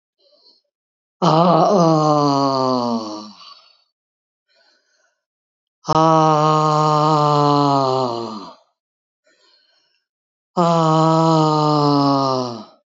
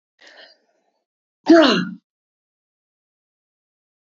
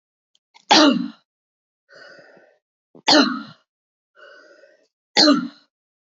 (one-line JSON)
{"exhalation_length": "12.9 s", "exhalation_amplitude": 28079, "exhalation_signal_mean_std_ratio": 0.62, "cough_length": "4.0 s", "cough_amplitude": 27660, "cough_signal_mean_std_ratio": 0.24, "three_cough_length": "6.1 s", "three_cough_amplitude": 31715, "three_cough_signal_mean_std_ratio": 0.31, "survey_phase": "beta (2021-08-13 to 2022-03-07)", "age": "65+", "gender": "Female", "wearing_mask": "No", "symptom_cough_any": true, "smoker_status": "Never smoked", "respiratory_condition_asthma": true, "respiratory_condition_other": false, "recruitment_source": "Test and Trace", "submission_delay": "1 day", "covid_test_result": "Positive", "covid_test_method": "RT-qPCR", "covid_ct_value": 24.5, "covid_ct_gene": "ORF1ab gene", "covid_ct_mean": 25.0, "covid_viral_load": "6400 copies/ml", "covid_viral_load_category": "Minimal viral load (< 10K copies/ml)"}